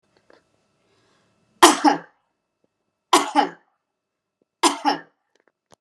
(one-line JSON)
{"three_cough_length": "5.8 s", "three_cough_amplitude": 32768, "three_cough_signal_mean_std_ratio": 0.26, "survey_phase": "beta (2021-08-13 to 2022-03-07)", "age": "45-64", "gender": "Female", "wearing_mask": "No", "symptom_none": true, "smoker_status": "Never smoked", "respiratory_condition_asthma": false, "respiratory_condition_other": false, "recruitment_source": "REACT", "submission_delay": "1 day", "covid_test_result": "Negative", "covid_test_method": "RT-qPCR"}